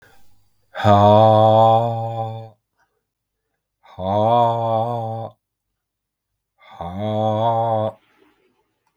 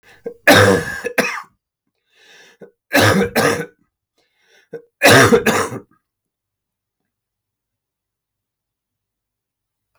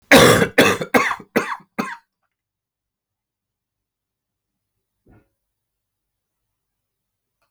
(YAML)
exhalation_length: 9.0 s
exhalation_amplitude: 32768
exhalation_signal_mean_std_ratio: 0.52
three_cough_length: 10.0 s
three_cough_amplitude: 32768
three_cough_signal_mean_std_ratio: 0.35
cough_length: 7.5 s
cough_amplitude: 32768
cough_signal_mean_std_ratio: 0.27
survey_phase: beta (2021-08-13 to 2022-03-07)
age: 45-64
gender: Male
wearing_mask: 'No'
symptom_cough_any: true
symptom_runny_or_blocked_nose: true
symptom_shortness_of_breath: true
symptom_fever_high_temperature: true
symptom_headache: true
symptom_onset: 3 days
smoker_status: Never smoked
respiratory_condition_asthma: false
respiratory_condition_other: false
recruitment_source: Test and Trace
submission_delay: 1 day
covid_test_result: Positive
covid_test_method: RT-qPCR
covid_ct_value: 16.9
covid_ct_gene: ORF1ab gene